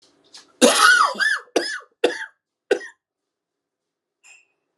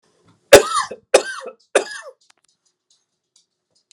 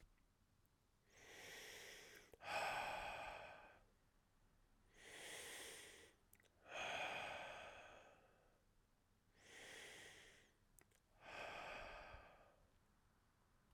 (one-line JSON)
{"cough_length": "4.8 s", "cough_amplitude": 32566, "cough_signal_mean_std_ratio": 0.37, "three_cough_length": "3.9 s", "three_cough_amplitude": 32768, "three_cough_signal_mean_std_ratio": 0.24, "exhalation_length": "13.7 s", "exhalation_amplitude": 659, "exhalation_signal_mean_std_ratio": 0.57, "survey_phase": "beta (2021-08-13 to 2022-03-07)", "age": "45-64", "gender": "Male", "wearing_mask": "No", "symptom_cough_any": true, "symptom_runny_or_blocked_nose": true, "symptom_diarrhoea": true, "symptom_fatigue": true, "symptom_headache": true, "symptom_loss_of_taste": true, "symptom_onset": "3 days", "smoker_status": "Never smoked", "respiratory_condition_asthma": false, "respiratory_condition_other": false, "recruitment_source": "Test and Trace", "submission_delay": "1 day", "covid_test_result": "Positive", "covid_test_method": "RT-qPCR"}